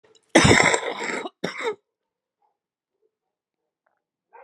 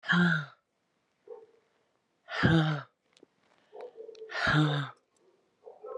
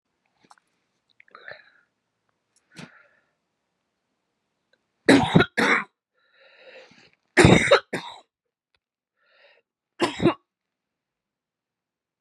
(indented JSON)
{
  "cough_length": "4.4 s",
  "cough_amplitude": 30827,
  "cough_signal_mean_std_ratio": 0.32,
  "exhalation_length": "6.0 s",
  "exhalation_amplitude": 11444,
  "exhalation_signal_mean_std_ratio": 0.43,
  "three_cough_length": "12.2 s",
  "three_cough_amplitude": 32413,
  "three_cough_signal_mean_std_ratio": 0.24,
  "survey_phase": "beta (2021-08-13 to 2022-03-07)",
  "age": "45-64",
  "gender": "Female",
  "wearing_mask": "No",
  "symptom_cough_any": true,
  "symptom_new_continuous_cough": true,
  "symptom_runny_or_blocked_nose": true,
  "symptom_sore_throat": true,
  "symptom_abdominal_pain": true,
  "symptom_diarrhoea": true,
  "symptom_fatigue": true,
  "symptom_fever_high_temperature": true,
  "symptom_headache": true,
  "symptom_change_to_sense_of_smell_or_taste": true,
  "symptom_loss_of_taste": true,
  "symptom_onset": "4 days",
  "smoker_status": "Current smoker (1 to 10 cigarettes per day)",
  "respiratory_condition_asthma": false,
  "respiratory_condition_other": false,
  "recruitment_source": "Test and Trace",
  "submission_delay": "1 day",
  "covid_test_result": "Positive",
  "covid_test_method": "RT-qPCR"
}